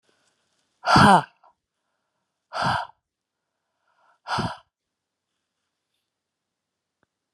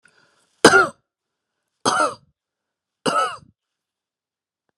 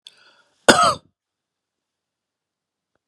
exhalation_length: 7.3 s
exhalation_amplitude: 27693
exhalation_signal_mean_std_ratio: 0.23
three_cough_length: 4.8 s
three_cough_amplitude: 32768
three_cough_signal_mean_std_ratio: 0.28
cough_length: 3.1 s
cough_amplitude: 32768
cough_signal_mean_std_ratio: 0.21
survey_phase: beta (2021-08-13 to 2022-03-07)
age: 45-64
gender: Female
wearing_mask: 'No'
symptom_none: true
smoker_status: Never smoked
respiratory_condition_asthma: false
respiratory_condition_other: false
recruitment_source: REACT
submission_delay: 2 days
covid_test_result: Negative
covid_test_method: RT-qPCR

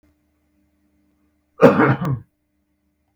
cough_length: 3.2 s
cough_amplitude: 32768
cough_signal_mean_std_ratio: 0.29
survey_phase: beta (2021-08-13 to 2022-03-07)
age: 45-64
gender: Male
wearing_mask: 'No'
symptom_none: true
smoker_status: Never smoked
respiratory_condition_asthma: false
respiratory_condition_other: false
recruitment_source: REACT
submission_delay: 2 days
covid_test_result: Negative
covid_test_method: RT-qPCR
influenza_a_test_result: Negative
influenza_b_test_result: Negative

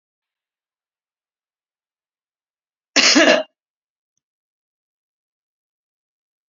cough_length: 6.5 s
cough_amplitude: 30270
cough_signal_mean_std_ratio: 0.21
survey_phase: beta (2021-08-13 to 2022-03-07)
age: 65+
gender: Female
wearing_mask: 'No'
symptom_cough_any: true
symptom_new_continuous_cough: true
symptom_sore_throat: true
smoker_status: Never smoked
respiratory_condition_asthma: false
respiratory_condition_other: false
recruitment_source: REACT
submission_delay: 2 days
covid_test_result: Positive
covid_test_method: RT-qPCR
covid_ct_value: 33.0
covid_ct_gene: E gene
influenza_a_test_result: Negative
influenza_b_test_result: Negative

